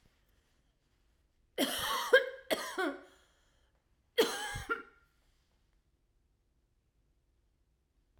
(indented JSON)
{
  "three_cough_length": "8.2 s",
  "three_cough_amplitude": 9246,
  "three_cough_signal_mean_std_ratio": 0.3,
  "survey_phase": "beta (2021-08-13 to 2022-03-07)",
  "age": "45-64",
  "gender": "Female",
  "wearing_mask": "No",
  "symptom_cough_any": true,
  "symptom_runny_or_blocked_nose": true,
  "symptom_onset": "13 days",
  "smoker_status": "Never smoked",
  "respiratory_condition_asthma": true,
  "respiratory_condition_other": false,
  "recruitment_source": "REACT",
  "submission_delay": "1 day",
  "covid_test_result": "Negative",
  "covid_test_method": "RT-qPCR",
  "influenza_a_test_result": "Unknown/Void",
  "influenza_b_test_result": "Unknown/Void"
}